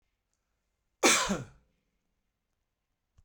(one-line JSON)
{"cough_length": "3.2 s", "cough_amplitude": 10647, "cough_signal_mean_std_ratio": 0.25, "survey_phase": "beta (2021-08-13 to 2022-03-07)", "age": "45-64", "gender": "Male", "wearing_mask": "No", "symptom_none": true, "smoker_status": "Ex-smoker", "respiratory_condition_asthma": false, "respiratory_condition_other": false, "recruitment_source": "Test and Trace", "submission_delay": "0 days", "covid_test_result": "Negative", "covid_test_method": "LFT"}